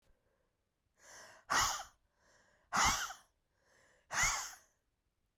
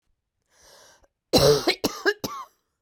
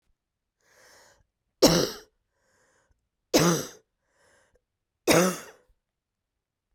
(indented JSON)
{
  "exhalation_length": "5.4 s",
  "exhalation_amplitude": 3842,
  "exhalation_signal_mean_std_ratio": 0.36,
  "cough_length": "2.8 s",
  "cough_amplitude": 21297,
  "cough_signal_mean_std_ratio": 0.37,
  "three_cough_length": "6.7 s",
  "three_cough_amplitude": 21197,
  "three_cough_signal_mean_std_ratio": 0.27,
  "survey_phase": "beta (2021-08-13 to 2022-03-07)",
  "age": "45-64",
  "gender": "Female",
  "wearing_mask": "No",
  "symptom_runny_or_blocked_nose": true,
  "symptom_shortness_of_breath": true,
  "symptom_abdominal_pain": true,
  "symptom_diarrhoea": true,
  "symptom_fatigue": true,
  "symptom_headache": true,
  "symptom_change_to_sense_of_smell_or_taste": true,
  "symptom_loss_of_taste": true,
  "smoker_status": "Never smoked",
  "respiratory_condition_asthma": true,
  "respiratory_condition_other": false,
  "recruitment_source": "Test and Trace",
  "submission_delay": "2 days",
  "covid_test_result": "Positive",
  "covid_test_method": "RT-qPCR",
  "covid_ct_value": 19.6,
  "covid_ct_gene": "ORF1ab gene"
}